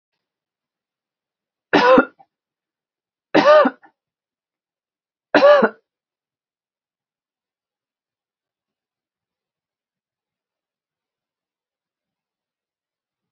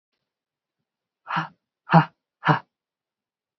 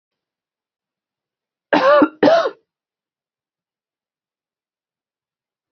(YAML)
three_cough_length: 13.3 s
three_cough_amplitude: 28458
three_cough_signal_mean_std_ratio: 0.22
exhalation_length: 3.6 s
exhalation_amplitude: 26020
exhalation_signal_mean_std_ratio: 0.23
cough_length: 5.7 s
cough_amplitude: 27411
cough_signal_mean_std_ratio: 0.27
survey_phase: beta (2021-08-13 to 2022-03-07)
age: 45-64
gender: Female
wearing_mask: 'Yes'
symptom_cough_any: true
symptom_runny_or_blocked_nose: true
symptom_sore_throat: true
symptom_fatigue: true
symptom_headache: true
smoker_status: Never smoked
respiratory_condition_asthma: false
respiratory_condition_other: false
recruitment_source: Test and Trace
submission_delay: 2 days
covid_test_result: Positive
covid_test_method: RT-qPCR
covid_ct_value: 16.0
covid_ct_gene: N gene
covid_ct_mean: 16.1
covid_viral_load: 5400000 copies/ml
covid_viral_load_category: High viral load (>1M copies/ml)